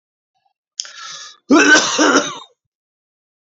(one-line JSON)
{"cough_length": "3.5 s", "cough_amplitude": 32300, "cough_signal_mean_std_ratio": 0.4, "survey_phase": "beta (2021-08-13 to 2022-03-07)", "age": "45-64", "gender": "Male", "wearing_mask": "No", "symptom_cough_any": true, "symptom_new_continuous_cough": true, "symptom_runny_or_blocked_nose": true, "symptom_sore_throat": true, "symptom_onset": "3 days", "smoker_status": "Never smoked", "respiratory_condition_asthma": false, "respiratory_condition_other": false, "recruitment_source": "Test and Trace", "submission_delay": "-1 day", "covid_test_result": "Positive", "covid_test_method": "RT-qPCR", "covid_ct_value": 18.1, "covid_ct_gene": "N gene"}